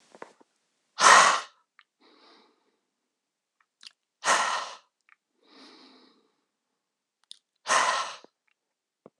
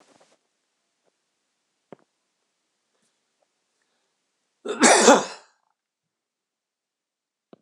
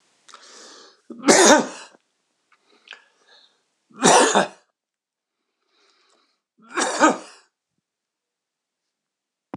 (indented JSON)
{
  "exhalation_length": "9.2 s",
  "exhalation_amplitude": 24689,
  "exhalation_signal_mean_std_ratio": 0.26,
  "cough_length": "7.6 s",
  "cough_amplitude": 26028,
  "cough_signal_mean_std_ratio": 0.19,
  "three_cough_length": "9.6 s",
  "three_cough_amplitude": 26028,
  "three_cough_signal_mean_std_ratio": 0.28,
  "survey_phase": "beta (2021-08-13 to 2022-03-07)",
  "age": "65+",
  "gender": "Male",
  "wearing_mask": "No",
  "symptom_none": true,
  "smoker_status": "Ex-smoker",
  "respiratory_condition_asthma": false,
  "respiratory_condition_other": false,
  "recruitment_source": "REACT",
  "submission_delay": "2 days",
  "covid_test_result": "Negative",
  "covid_test_method": "RT-qPCR",
  "influenza_a_test_result": "Unknown/Void",
  "influenza_b_test_result": "Unknown/Void"
}